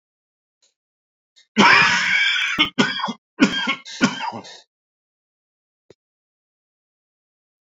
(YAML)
cough_length: 7.8 s
cough_amplitude: 28092
cough_signal_mean_std_ratio: 0.39
survey_phase: beta (2021-08-13 to 2022-03-07)
age: 65+
gender: Male
wearing_mask: 'No'
symptom_cough_any: true
symptom_onset: 2 days
smoker_status: Ex-smoker
respiratory_condition_asthma: true
respiratory_condition_other: false
recruitment_source: Test and Trace
submission_delay: 1 day
covid_test_result: Negative
covid_test_method: RT-qPCR